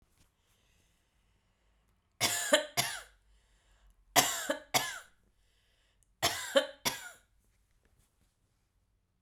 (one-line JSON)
{"three_cough_length": "9.2 s", "three_cough_amplitude": 12881, "three_cough_signal_mean_std_ratio": 0.3, "survey_phase": "beta (2021-08-13 to 2022-03-07)", "age": "45-64", "gender": "Female", "wearing_mask": "No", "symptom_fatigue": true, "smoker_status": "Never smoked", "respiratory_condition_asthma": true, "respiratory_condition_other": false, "recruitment_source": "REACT", "submission_delay": "3 days", "covid_test_result": "Negative", "covid_test_method": "RT-qPCR"}